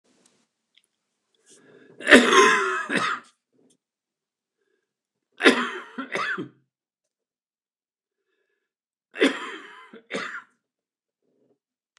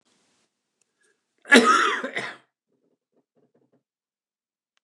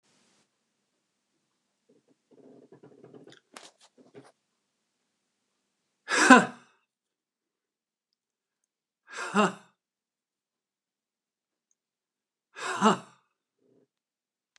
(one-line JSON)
{"three_cough_length": "12.0 s", "three_cough_amplitude": 29204, "three_cough_signal_mean_std_ratio": 0.28, "cough_length": "4.8 s", "cough_amplitude": 29204, "cough_signal_mean_std_ratio": 0.26, "exhalation_length": "14.6 s", "exhalation_amplitude": 28162, "exhalation_signal_mean_std_ratio": 0.17, "survey_phase": "beta (2021-08-13 to 2022-03-07)", "age": "65+", "gender": "Male", "wearing_mask": "No", "symptom_cough_any": true, "symptom_runny_or_blocked_nose": true, "symptom_sore_throat": true, "symptom_fatigue": true, "symptom_headache": true, "symptom_change_to_sense_of_smell_or_taste": true, "symptom_onset": "5 days", "smoker_status": "Never smoked", "respiratory_condition_asthma": false, "respiratory_condition_other": false, "recruitment_source": "Test and Trace", "submission_delay": "2 days", "covid_test_result": "Positive", "covid_test_method": "RT-qPCR", "covid_ct_value": 18.1, "covid_ct_gene": "ORF1ab gene", "covid_ct_mean": 19.3, "covid_viral_load": "470000 copies/ml", "covid_viral_load_category": "Low viral load (10K-1M copies/ml)"}